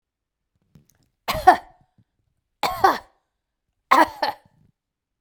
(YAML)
three_cough_length: 5.2 s
three_cough_amplitude: 32767
three_cough_signal_mean_std_ratio: 0.26
survey_phase: beta (2021-08-13 to 2022-03-07)
age: 45-64
gender: Female
wearing_mask: 'No'
symptom_none: true
smoker_status: Never smoked
respiratory_condition_asthma: false
respiratory_condition_other: false
recruitment_source: REACT
submission_delay: 2 days
covid_test_result: Negative
covid_test_method: RT-qPCR